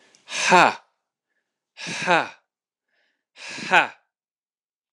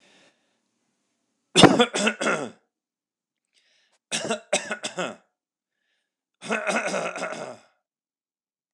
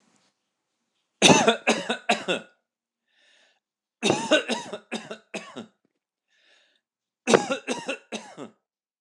exhalation_length: 4.9 s
exhalation_amplitude: 26027
exhalation_signal_mean_std_ratio: 0.3
three_cough_length: 8.7 s
three_cough_amplitude: 26028
three_cough_signal_mean_std_ratio: 0.31
cough_length: 9.0 s
cough_amplitude: 26028
cough_signal_mean_std_ratio: 0.32
survey_phase: alpha (2021-03-01 to 2021-08-12)
age: 45-64
gender: Male
wearing_mask: 'No'
symptom_none: true
smoker_status: Ex-smoker
respiratory_condition_asthma: false
respiratory_condition_other: false
recruitment_source: REACT
submission_delay: 2 days
covid_test_result: Negative
covid_test_method: RT-qPCR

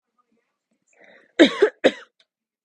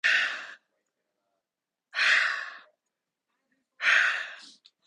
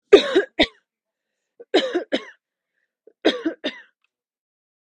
cough_length: 2.6 s
cough_amplitude: 31349
cough_signal_mean_std_ratio: 0.24
exhalation_length: 4.9 s
exhalation_amplitude: 11280
exhalation_signal_mean_std_ratio: 0.42
three_cough_length: 4.9 s
three_cough_amplitude: 32564
three_cough_signal_mean_std_ratio: 0.28
survey_phase: beta (2021-08-13 to 2022-03-07)
age: 18-44
gender: Female
wearing_mask: 'No'
symptom_fatigue: true
symptom_headache: true
smoker_status: Never smoked
respiratory_condition_asthma: false
respiratory_condition_other: false
recruitment_source: REACT
submission_delay: 2 days
covid_test_result: Negative
covid_test_method: RT-qPCR
influenza_a_test_result: Negative
influenza_b_test_result: Negative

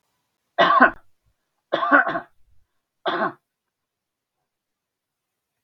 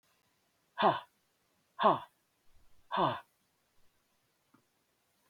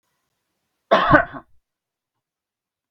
three_cough_length: 5.6 s
three_cough_amplitude: 32768
three_cough_signal_mean_std_ratio: 0.3
exhalation_length: 5.3 s
exhalation_amplitude: 7684
exhalation_signal_mean_std_ratio: 0.27
cough_length: 2.9 s
cough_amplitude: 32768
cough_signal_mean_std_ratio: 0.26
survey_phase: beta (2021-08-13 to 2022-03-07)
age: 65+
gender: Male
wearing_mask: 'No'
symptom_none: true
smoker_status: Never smoked
respiratory_condition_asthma: false
respiratory_condition_other: false
recruitment_source: REACT
submission_delay: 5 days
covid_test_result: Negative
covid_test_method: RT-qPCR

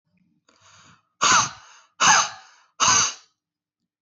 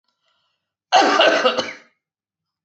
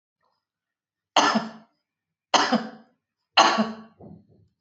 exhalation_length: 4.0 s
exhalation_amplitude: 21330
exhalation_signal_mean_std_ratio: 0.39
cough_length: 2.6 s
cough_amplitude: 26517
cough_signal_mean_std_ratio: 0.43
three_cough_length: 4.6 s
three_cough_amplitude: 27889
three_cough_signal_mean_std_ratio: 0.34
survey_phase: beta (2021-08-13 to 2022-03-07)
age: 45-64
gender: Female
wearing_mask: 'No'
symptom_fatigue: true
symptom_onset: 8 days
smoker_status: Current smoker (e-cigarettes or vapes only)
respiratory_condition_asthma: false
respiratory_condition_other: false
recruitment_source: REACT
submission_delay: 2 days
covid_test_result: Negative
covid_test_method: RT-qPCR
influenza_a_test_result: Negative
influenza_b_test_result: Negative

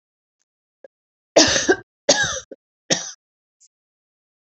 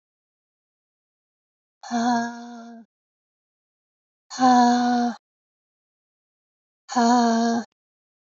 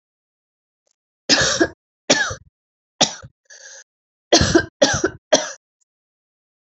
three_cough_length: 4.5 s
three_cough_amplitude: 32064
three_cough_signal_mean_std_ratio: 0.3
exhalation_length: 8.4 s
exhalation_amplitude: 17280
exhalation_signal_mean_std_ratio: 0.4
cough_length: 6.7 s
cough_amplitude: 32768
cough_signal_mean_std_ratio: 0.34
survey_phase: alpha (2021-03-01 to 2021-08-12)
age: 45-64
gender: Female
wearing_mask: 'No'
symptom_cough_any: true
symptom_new_continuous_cough: true
symptom_shortness_of_breath: true
symptom_fatigue: true
symptom_fever_high_temperature: true
symptom_headache: true
symptom_onset: 3 days
smoker_status: Never smoked
respiratory_condition_asthma: false
respiratory_condition_other: false
recruitment_source: Test and Trace
submission_delay: 2 days
covid_test_result: Positive
covid_test_method: RT-qPCR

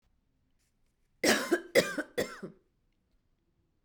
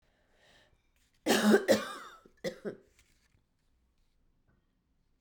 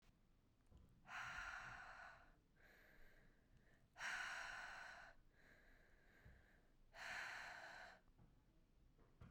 cough_length: 3.8 s
cough_amplitude: 10459
cough_signal_mean_std_ratio: 0.32
three_cough_length: 5.2 s
three_cough_amplitude: 9206
three_cough_signal_mean_std_ratio: 0.28
exhalation_length: 9.3 s
exhalation_amplitude: 386
exhalation_signal_mean_std_ratio: 0.64
survey_phase: beta (2021-08-13 to 2022-03-07)
age: 18-44
gender: Female
wearing_mask: 'No'
symptom_cough_any: true
symptom_runny_or_blocked_nose: true
symptom_sore_throat: true
symptom_other: true
symptom_onset: 5 days
smoker_status: Ex-smoker
respiratory_condition_asthma: false
respiratory_condition_other: false
recruitment_source: Test and Trace
submission_delay: 1 day
covid_test_result: Positive
covid_test_method: RT-qPCR
covid_ct_value: 25.8
covid_ct_gene: N gene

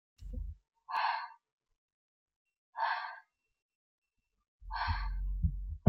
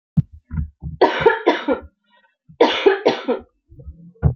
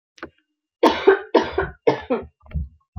exhalation_length: 5.9 s
exhalation_amplitude: 12652
exhalation_signal_mean_std_ratio: 0.41
cough_length: 4.4 s
cough_amplitude: 32348
cough_signal_mean_std_ratio: 0.46
three_cough_length: 3.0 s
three_cough_amplitude: 30715
three_cough_signal_mean_std_ratio: 0.41
survey_phase: beta (2021-08-13 to 2022-03-07)
age: 18-44
gender: Female
wearing_mask: 'Yes'
symptom_none: true
smoker_status: Current smoker (1 to 10 cigarettes per day)
respiratory_condition_asthma: false
respiratory_condition_other: false
recruitment_source: REACT
submission_delay: 2 days
covid_test_result: Negative
covid_test_method: RT-qPCR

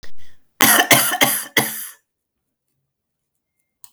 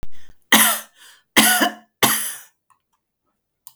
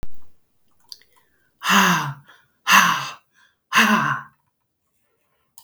cough_length: 3.9 s
cough_amplitude: 32768
cough_signal_mean_std_ratio: 0.43
three_cough_length: 3.8 s
three_cough_amplitude: 32768
three_cough_signal_mean_std_ratio: 0.44
exhalation_length: 5.6 s
exhalation_amplitude: 32766
exhalation_signal_mean_std_ratio: 0.43
survey_phase: beta (2021-08-13 to 2022-03-07)
age: 45-64
gender: Female
wearing_mask: 'No'
symptom_none: true
smoker_status: Ex-smoker
respiratory_condition_asthma: false
respiratory_condition_other: false
recruitment_source: REACT
submission_delay: 2 days
covid_test_result: Negative
covid_test_method: RT-qPCR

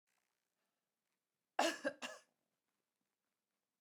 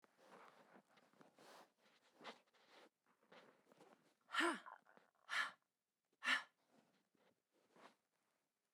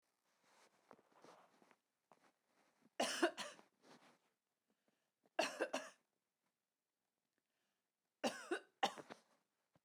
cough_length: 3.8 s
cough_amplitude: 2988
cough_signal_mean_std_ratio: 0.22
exhalation_length: 8.7 s
exhalation_amplitude: 1655
exhalation_signal_mean_std_ratio: 0.26
three_cough_length: 9.8 s
three_cough_amplitude: 2415
three_cough_signal_mean_std_ratio: 0.26
survey_phase: beta (2021-08-13 to 2022-03-07)
age: 65+
gender: Female
wearing_mask: 'No'
symptom_none: true
smoker_status: Never smoked
respiratory_condition_asthma: false
respiratory_condition_other: false
recruitment_source: REACT
submission_delay: 1 day
covid_test_result: Negative
covid_test_method: RT-qPCR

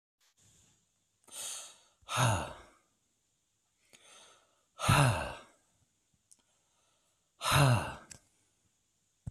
exhalation_length: 9.3 s
exhalation_amplitude: 10011
exhalation_signal_mean_std_ratio: 0.32
survey_phase: beta (2021-08-13 to 2022-03-07)
age: 45-64
gender: Male
wearing_mask: 'No'
symptom_none: true
smoker_status: Never smoked
respiratory_condition_asthma: false
respiratory_condition_other: false
recruitment_source: REACT
submission_delay: 1 day
covid_test_result: Negative
covid_test_method: RT-qPCR
influenza_a_test_result: Negative
influenza_b_test_result: Negative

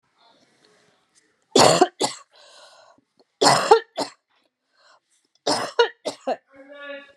three_cough_length: 7.2 s
three_cough_amplitude: 32664
three_cough_signal_mean_std_ratio: 0.32
survey_phase: beta (2021-08-13 to 2022-03-07)
age: 45-64
gender: Female
wearing_mask: 'No'
symptom_none: true
smoker_status: Never smoked
respiratory_condition_asthma: false
respiratory_condition_other: false
recruitment_source: REACT
submission_delay: 1 day
covid_test_result: Negative
covid_test_method: RT-qPCR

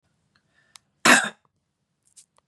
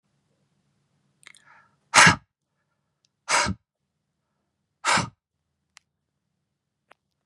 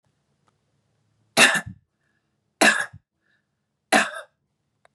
cough_length: 2.5 s
cough_amplitude: 27639
cough_signal_mean_std_ratio: 0.22
exhalation_length: 7.3 s
exhalation_amplitude: 31877
exhalation_signal_mean_std_ratio: 0.21
three_cough_length: 4.9 s
three_cough_amplitude: 30429
three_cough_signal_mean_std_ratio: 0.27
survey_phase: beta (2021-08-13 to 2022-03-07)
age: 18-44
gender: Female
wearing_mask: 'No'
symptom_none: true
smoker_status: Never smoked
respiratory_condition_asthma: false
respiratory_condition_other: false
recruitment_source: REACT
submission_delay: 0 days
covid_test_result: Negative
covid_test_method: RT-qPCR
influenza_a_test_result: Negative
influenza_b_test_result: Negative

